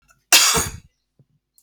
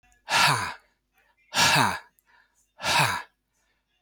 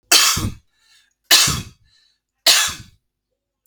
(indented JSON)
{
  "cough_length": "1.6 s",
  "cough_amplitude": 32768,
  "cough_signal_mean_std_ratio": 0.36,
  "exhalation_length": "4.0 s",
  "exhalation_amplitude": 17958,
  "exhalation_signal_mean_std_ratio": 0.45,
  "three_cough_length": "3.7 s",
  "three_cough_amplitude": 32768,
  "three_cough_signal_mean_std_ratio": 0.39,
  "survey_phase": "alpha (2021-03-01 to 2021-08-12)",
  "age": "45-64",
  "gender": "Male",
  "wearing_mask": "No",
  "symptom_none": true,
  "smoker_status": "Never smoked",
  "respiratory_condition_asthma": false,
  "respiratory_condition_other": false,
  "recruitment_source": "REACT",
  "submission_delay": "2 days",
  "covid_test_result": "Negative",
  "covid_test_method": "RT-qPCR"
}